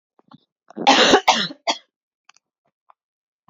{
  "cough_length": "3.5 s",
  "cough_amplitude": 32767,
  "cough_signal_mean_std_ratio": 0.33,
  "survey_phase": "beta (2021-08-13 to 2022-03-07)",
  "age": "18-44",
  "gender": "Female",
  "wearing_mask": "No",
  "symptom_runny_or_blocked_nose": true,
  "symptom_headache": true,
  "smoker_status": "Never smoked",
  "respiratory_condition_asthma": false,
  "respiratory_condition_other": false,
  "recruitment_source": "Test and Trace",
  "submission_delay": "2 days",
  "covid_test_result": "Positive",
  "covid_test_method": "ePCR"
}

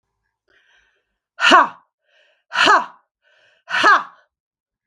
{
  "exhalation_length": "4.9 s",
  "exhalation_amplitude": 32768,
  "exhalation_signal_mean_std_ratio": 0.33,
  "survey_phase": "beta (2021-08-13 to 2022-03-07)",
  "age": "45-64",
  "gender": "Female",
  "wearing_mask": "No",
  "symptom_cough_any": true,
  "symptom_runny_or_blocked_nose": true,
  "symptom_sore_throat": true,
  "symptom_headache": true,
  "symptom_onset": "3 days",
  "smoker_status": "Ex-smoker",
  "respiratory_condition_asthma": false,
  "respiratory_condition_other": false,
  "recruitment_source": "Test and Trace",
  "submission_delay": "1 day",
  "covid_test_result": "Positive",
  "covid_test_method": "RT-qPCR",
  "covid_ct_value": 20.1,
  "covid_ct_gene": "ORF1ab gene"
}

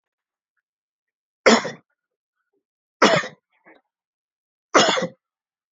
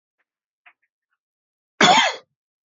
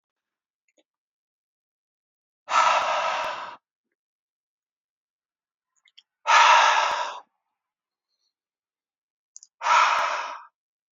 {
  "three_cough_length": "5.7 s",
  "three_cough_amplitude": 28899,
  "three_cough_signal_mean_std_ratio": 0.27,
  "cough_length": "2.6 s",
  "cough_amplitude": 32767,
  "cough_signal_mean_std_ratio": 0.28,
  "exhalation_length": "10.9 s",
  "exhalation_amplitude": 21388,
  "exhalation_signal_mean_std_ratio": 0.36,
  "survey_phase": "beta (2021-08-13 to 2022-03-07)",
  "age": "18-44",
  "gender": "Male",
  "wearing_mask": "No",
  "symptom_none": true,
  "symptom_onset": "12 days",
  "smoker_status": "Current smoker (1 to 10 cigarettes per day)",
  "respiratory_condition_asthma": false,
  "respiratory_condition_other": false,
  "recruitment_source": "REACT",
  "submission_delay": "2 days",
  "covid_test_result": "Negative",
  "covid_test_method": "RT-qPCR",
  "influenza_a_test_result": "Negative",
  "influenza_b_test_result": "Negative"
}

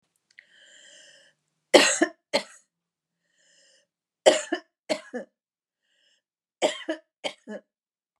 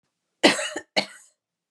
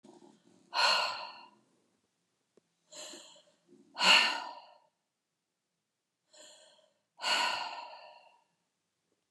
{
  "three_cough_length": "8.2 s",
  "three_cough_amplitude": 27623,
  "three_cough_signal_mean_std_ratio": 0.24,
  "cough_length": "1.7 s",
  "cough_amplitude": 26375,
  "cough_signal_mean_std_ratio": 0.31,
  "exhalation_length": "9.3 s",
  "exhalation_amplitude": 9808,
  "exhalation_signal_mean_std_ratio": 0.31,
  "survey_phase": "beta (2021-08-13 to 2022-03-07)",
  "age": "65+",
  "gender": "Female",
  "wearing_mask": "No",
  "symptom_none": true,
  "smoker_status": "Never smoked",
  "respiratory_condition_asthma": false,
  "respiratory_condition_other": false,
  "recruitment_source": "REACT",
  "submission_delay": "1 day",
  "covid_test_result": "Negative",
  "covid_test_method": "RT-qPCR"
}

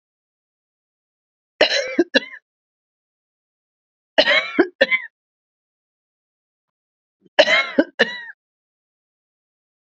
{
  "three_cough_length": "9.9 s",
  "three_cough_amplitude": 30719,
  "three_cough_signal_mean_std_ratio": 0.28,
  "survey_phase": "beta (2021-08-13 to 2022-03-07)",
  "age": "45-64",
  "gender": "Female",
  "wearing_mask": "No",
  "symptom_cough_any": true,
  "symptom_runny_or_blocked_nose": true,
  "symptom_shortness_of_breath": true,
  "symptom_fatigue": true,
  "symptom_headache": true,
  "symptom_other": true,
  "symptom_onset": "2 days",
  "smoker_status": "Ex-smoker",
  "respiratory_condition_asthma": false,
  "respiratory_condition_other": false,
  "recruitment_source": "Test and Trace",
  "submission_delay": "0 days",
  "covid_test_result": "Positive",
  "covid_test_method": "RT-qPCR",
  "covid_ct_value": 15.0,
  "covid_ct_gene": "ORF1ab gene",
  "covid_ct_mean": 15.4,
  "covid_viral_load": "9100000 copies/ml",
  "covid_viral_load_category": "High viral load (>1M copies/ml)"
}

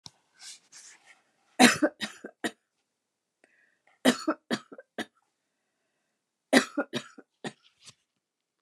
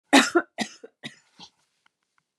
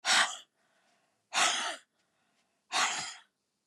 {
  "three_cough_length": "8.6 s",
  "three_cough_amplitude": 26868,
  "three_cough_signal_mean_std_ratio": 0.23,
  "cough_length": "2.4 s",
  "cough_amplitude": 27183,
  "cough_signal_mean_std_ratio": 0.26,
  "exhalation_length": "3.7 s",
  "exhalation_amplitude": 8350,
  "exhalation_signal_mean_std_ratio": 0.42,
  "survey_phase": "beta (2021-08-13 to 2022-03-07)",
  "age": "65+",
  "gender": "Female",
  "wearing_mask": "No",
  "symptom_none": true,
  "smoker_status": "Never smoked",
  "respiratory_condition_asthma": false,
  "respiratory_condition_other": false,
  "recruitment_source": "REACT",
  "submission_delay": "3 days",
  "covid_test_result": "Negative",
  "covid_test_method": "RT-qPCR",
  "influenza_a_test_result": "Negative",
  "influenza_b_test_result": "Negative"
}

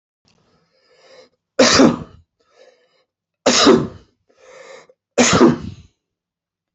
{
  "three_cough_length": "6.7 s",
  "three_cough_amplitude": 29590,
  "three_cough_signal_mean_std_ratio": 0.35,
  "survey_phase": "beta (2021-08-13 to 2022-03-07)",
  "age": "65+",
  "gender": "Male",
  "wearing_mask": "No",
  "symptom_none": true,
  "symptom_onset": "12 days",
  "smoker_status": "Ex-smoker",
  "respiratory_condition_asthma": false,
  "respiratory_condition_other": false,
  "recruitment_source": "REACT",
  "submission_delay": "5 days",
  "covid_test_result": "Negative",
  "covid_test_method": "RT-qPCR"
}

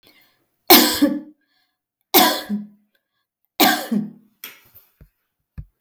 {
  "three_cough_length": "5.8 s",
  "three_cough_amplitude": 32768,
  "three_cough_signal_mean_std_ratio": 0.35,
  "survey_phase": "beta (2021-08-13 to 2022-03-07)",
  "age": "45-64",
  "gender": "Female",
  "wearing_mask": "No",
  "symptom_none": true,
  "smoker_status": "Ex-smoker",
  "respiratory_condition_asthma": false,
  "respiratory_condition_other": false,
  "recruitment_source": "REACT",
  "submission_delay": "5 days",
  "covid_test_result": "Negative",
  "covid_test_method": "RT-qPCR",
  "influenza_a_test_result": "Negative",
  "influenza_b_test_result": "Negative"
}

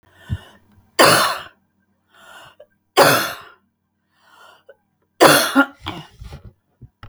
{
  "three_cough_length": "7.1 s",
  "three_cough_amplitude": 32768,
  "three_cough_signal_mean_std_ratio": 0.34,
  "survey_phase": "beta (2021-08-13 to 2022-03-07)",
  "age": "65+",
  "gender": "Female",
  "wearing_mask": "No",
  "symptom_none": true,
  "smoker_status": "Never smoked",
  "respiratory_condition_asthma": false,
  "respiratory_condition_other": false,
  "recruitment_source": "REACT",
  "submission_delay": "1 day",
  "covid_test_result": "Negative",
  "covid_test_method": "RT-qPCR"
}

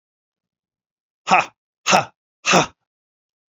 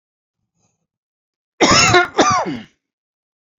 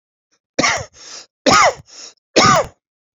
{
  "exhalation_length": "3.5 s",
  "exhalation_amplitude": 32767,
  "exhalation_signal_mean_std_ratio": 0.29,
  "cough_length": "3.6 s",
  "cough_amplitude": 31204,
  "cough_signal_mean_std_ratio": 0.39,
  "three_cough_length": "3.2 s",
  "three_cough_amplitude": 30800,
  "three_cough_signal_mean_std_ratio": 0.43,
  "survey_phase": "beta (2021-08-13 to 2022-03-07)",
  "age": "45-64",
  "gender": "Male",
  "wearing_mask": "No",
  "symptom_runny_or_blocked_nose": true,
  "symptom_headache": true,
  "smoker_status": "Current smoker (e-cigarettes or vapes only)",
  "respiratory_condition_asthma": false,
  "respiratory_condition_other": false,
  "recruitment_source": "Test and Trace",
  "submission_delay": "2 days",
  "covid_test_result": "Positive",
  "covid_test_method": "RT-qPCR"
}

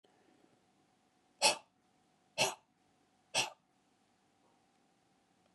{
  "exhalation_length": "5.5 s",
  "exhalation_amplitude": 6125,
  "exhalation_signal_mean_std_ratio": 0.22,
  "survey_phase": "beta (2021-08-13 to 2022-03-07)",
  "age": "18-44",
  "gender": "Male",
  "wearing_mask": "No",
  "symptom_none": true,
  "smoker_status": "Never smoked",
  "respiratory_condition_asthma": false,
  "respiratory_condition_other": false,
  "recruitment_source": "REACT",
  "submission_delay": "3 days",
  "covid_test_result": "Negative",
  "covid_test_method": "RT-qPCR",
  "influenza_a_test_result": "Negative",
  "influenza_b_test_result": "Negative"
}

